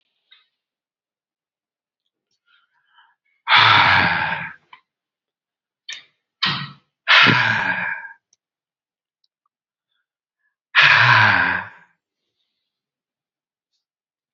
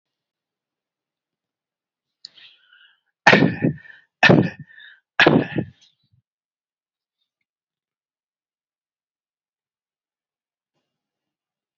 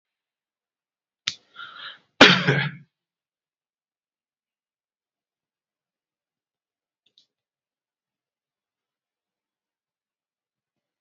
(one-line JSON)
{"exhalation_length": "14.3 s", "exhalation_amplitude": 32768, "exhalation_signal_mean_std_ratio": 0.35, "three_cough_length": "11.8 s", "three_cough_amplitude": 30179, "three_cough_signal_mean_std_ratio": 0.21, "cough_length": "11.0 s", "cough_amplitude": 29783, "cough_signal_mean_std_ratio": 0.14, "survey_phase": "beta (2021-08-13 to 2022-03-07)", "age": "18-44", "gender": "Male", "wearing_mask": "Yes", "symptom_none": true, "smoker_status": "Never smoked", "respiratory_condition_asthma": false, "respiratory_condition_other": false, "recruitment_source": "REACT", "submission_delay": "2 days", "covid_test_result": "Positive", "covid_test_method": "RT-qPCR", "covid_ct_value": 35.5, "covid_ct_gene": "N gene", "influenza_a_test_result": "Negative", "influenza_b_test_result": "Negative"}